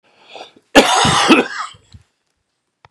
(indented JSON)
{
  "cough_length": "2.9 s",
  "cough_amplitude": 32768,
  "cough_signal_mean_std_ratio": 0.42,
  "survey_phase": "beta (2021-08-13 to 2022-03-07)",
  "age": "65+",
  "gender": "Male",
  "wearing_mask": "No",
  "symptom_cough_any": true,
  "symptom_shortness_of_breath": true,
  "symptom_fatigue": true,
  "symptom_fever_high_temperature": true,
  "symptom_headache": true,
  "symptom_change_to_sense_of_smell_or_taste": true,
  "symptom_loss_of_taste": true,
  "symptom_onset": "4 days",
  "smoker_status": "Never smoked",
  "respiratory_condition_asthma": false,
  "respiratory_condition_other": false,
  "recruitment_source": "Test and Trace",
  "submission_delay": "2 days",
  "covid_test_result": "Positive",
  "covid_test_method": "RT-qPCR"
}